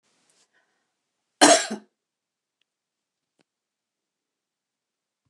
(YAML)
cough_length: 5.3 s
cough_amplitude: 28534
cough_signal_mean_std_ratio: 0.16
survey_phase: beta (2021-08-13 to 2022-03-07)
age: 65+
gender: Female
wearing_mask: 'No'
symptom_none: true
smoker_status: Never smoked
respiratory_condition_asthma: false
respiratory_condition_other: false
recruitment_source: REACT
submission_delay: 1 day
covid_test_result: Negative
covid_test_method: RT-qPCR